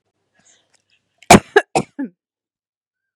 {"cough_length": "3.2 s", "cough_amplitude": 32768, "cough_signal_mean_std_ratio": 0.2, "survey_phase": "beta (2021-08-13 to 2022-03-07)", "age": "18-44", "gender": "Female", "wearing_mask": "No", "symptom_headache": true, "smoker_status": "Never smoked", "respiratory_condition_asthma": false, "respiratory_condition_other": false, "recruitment_source": "REACT", "submission_delay": "4 days", "covid_test_result": "Negative", "covid_test_method": "RT-qPCR", "influenza_a_test_result": "Negative", "influenza_b_test_result": "Negative"}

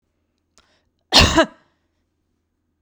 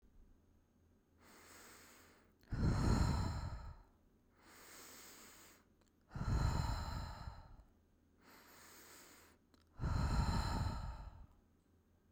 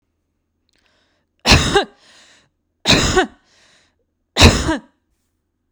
{"cough_length": "2.8 s", "cough_amplitude": 32768, "cough_signal_mean_std_ratio": 0.26, "exhalation_length": "12.1 s", "exhalation_amplitude": 2666, "exhalation_signal_mean_std_ratio": 0.49, "three_cough_length": "5.7 s", "three_cough_amplitude": 32768, "three_cough_signal_mean_std_ratio": 0.33, "survey_phase": "beta (2021-08-13 to 2022-03-07)", "age": "18-44", "gender": "Female", "wearing_mask": "No", "symptom_none": true, "smoker_status": "Ex-smoker", "respiratory_condition_asthma": false, "respiratory_condition_other": false, "recruitment_source": "REACT", "submission_delay": "0 days", "covid_test_result": "Negative", "covid_test_method": "RT-qPCR"}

